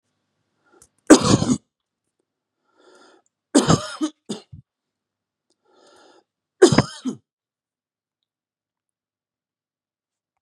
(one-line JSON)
{"three_cough_length": "10.4 s", "three_cough_amplitude": 32768, "three_cough_signal_mean_std_ratio": 0.22, "survey_phase": "beta (2021-08-13 to 2022-03-07)", "age": "45-64", "gender": "Male", "wearing_mask": "No", "symptom_none": true, "smoker_status": "Never smoked", "respiratory_condition_asthma": false, "respiratory_condition_other": false, "recruitment_source": "REACT", "submission_delay": "1 day", "covid_test_result": "Negative", "covid_test_method": "RT-qPCR"}